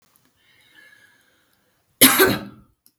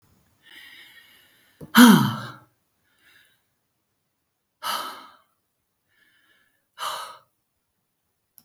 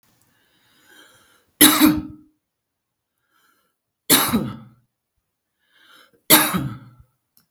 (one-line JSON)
{"cough_length": "3.0 s", "cough_amplitude": 32768, "cough_signal_mean_std_ratio": 0.27, "exhalation_length": "8.4 s", "exhalation_amplitude": 32766, "exhalation_signal_mean_std_ratio": 0.21, "three_cough_length": "7.5 s", "three_cough_amplitude": 32768, "three_cough_signal_mean_std_ratio": 0.3, "survey_phase": "beta (2021-08-13 to 2022-03-07)", "age": "65+", "gender": "Female", "wearing_mask": "No", "symptom_fatigue": true, "symptom_onset": "12 days", "smoker_status": "Ex-smoker", "respiratory_condition_asthma": true, "respiratory_condition_other": false, "recruitment_source": "REACT", "submission_delay": "3 days", "covid_test_result": "Negative", "covid_test_method": "RT-qPCR", "influenza_a_test_result": "Negative", "influenza_b_test_result": "Negative"}